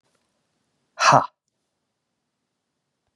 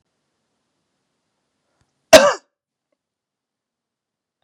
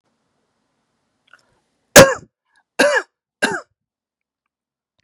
{"exhalation_length": "3.2 s", "exhalation_amplitude": 29162, "exhalation_signal_mean_std_ratio": 0.2, "cough_length": "4.4 s", "cough_amplitude": 32768, "cough_signal_mean_std_ratio": 0.15, "three_cough_length": "5.0 s", "three_cough_amplitude": 32768, "three_cough_signal_mean_std_ratio": 0.22, "survey_phase": "beta (2021-08-13 to 2022-03-07)", "age": "45-64", "gender": "Male", "wearing_mask": "No", "symptom_runny_or_blocked_nose": true, "symptom_onset": "8 days", "smoker_status": "Ex-smoker", "respiratory_condition_asthma": false, "respiratory_condition_other": false, "recruitment_source": "REACT", "submission_delay": "1 day", "covid_test_result": "Negative", "covid_test_method": "RT-qPCR", "influenza_a_test_result": "Negative", "influenza_b_test_result": "Negative"}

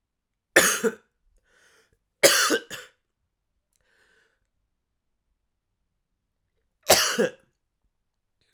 {"three_cough_length": "8.5 s", "three_cough_amplitude": 32767, "three_cough_signal_mean_std_ratio": 0.26, "survey_phase": "beta (2021-08-13 to 2022-03-07)", "age": "18-44", "gender": "Male", "wearing_mask": "No", "symptom_cough_any": true, "symptom_runny_or_blocked_nose": true, "symptom_shortness_of_breath": true, "symptom_sore_throat": true, "symptom_abdominal_pain": true, "symptom_fatigue": true, "symptom_fever_high_temperature": true, "symptom_headache": true, "symptom_change_to_sense_of_smell_or_taste": true, "symptom_onset": "3 days", "smoker_status": "Ex-smoker", "respiratory_condition_asthma": false, "respiratory_condition_other": false, "recruitment_source": "Test and Trace", "submission_delay": "2 days", "covid_test_result": "Positive", "covid_test_method": "RT-qPCR", "covid_ct_value": 15.8, "covid_ct_gene": "ORF1ab gene", "covid_ct_mean": 16.3, "covid_viral_load": "4600000 copies/ml", "covid_viral_load_category": "High viral load (>1M copies/ml)"}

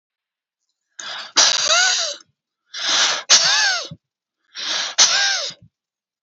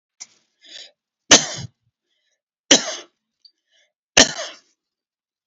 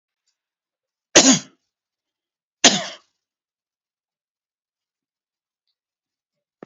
{"exhalation_length": "6.2 s", "exhalation_amplitude": 32768, "exhalation_signal_mean_std_ratio": 0.53, "three_cough_length": "5.5 s", "three_cough_amplitude": 32768, "three_cough_signal_mean_std_ratio": 0.22, "cough_length": "6.7 s", "cough_amplitude": 32626, "cough_signal_mean_std_ratio": 0.18, "survey_phase": "alpha (2021-03-01 to 2021-08-12)", "age": "65+", "gender": "Male", "wearing_mask": "No", "symptom_none": true, "smoker_status": "Never smoked", "respiratory_condition_asthma": false, "respiratory_condition_other": false, "recruitment_source": "Test and Trace", "submission_delay": "1 day", "covid_test_result": "Positive", "covid_test_method": "RT-qPCR", "covid_ct_value": 20.0, "covid_ct_gene": "ORF1ab gene", "covid_ct_mean": 20.2, "covid_viral_load": "230000 copies/ml", "covid_viral_load_category": "Low viral load (10K-1M copies/ml)"}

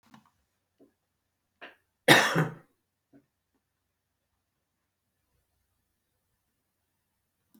{"cough_length": "7.6 s", "cough_amplitude": 27011, "cough_signal_mean_std_ratio": 0.17, "survey_phase": "beta (2021-08-13 to 2022-03-07)", "age": "65+", "gender": "Male", "wearing_mask": "No", "symptom_none": true, "symptom_onset": "3 days", "smoker_status": "Never smoked", "respiratory_condition_asthma": false, "respiratory_condition_other": false, "recruitment_source": "REACT", "submission_delay": "2 days", "covid_test_result": "Negative", "covid_test_method": "RT-qPCR", "influenza_a_test_result": "Negative", "influenza_b_test_result": "Negative"}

